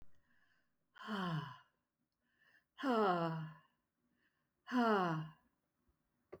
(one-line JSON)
{"exhalation_length": "6.4 s", "exhalation_amplitude": 2512, "exhalation_signal_mean_std_ratio": 0.43, "survey_phase": "beta (2021-08-13 to 2022-03-07)", "age": "65+", "gender": "Female", "wearing_mask": "No", "symptom_none": true, "smoker_status": "Never smoked", "respiratory_condition_asthma": false, "respiratory_condition_other": false, "recruitment_source": "Test and Trace", "submission_delay": "0 days", "covid_test_result": "Negative", "covid_test_method": "LFT"}